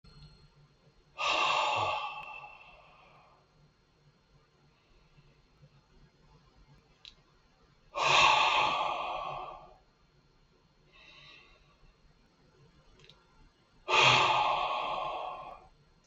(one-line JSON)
{"exhalation_length": "16.1 s", "exhalation_amplitude": 13581, "exhalation_signal_mean_std_ratio": 0.41, "survey_phase": "beta (2021-08-13 to 2022-03-07)", "age": "65+", "gender": "Male", "wearing_mask": "No", "symptom_none": true, "smoker_status": "Never smoked", "respiratory_condition_asthma": true, "respiratory_condition_other": false, "recruitment_source": "REACT", "submission_delay": "2 days", "covid_test_result": "Negative", "covid_test_method": "RT-qPCR", "influenza_a_test_result": "Unknown/Void", "influenza_b_test_result": "Unknown/Void"}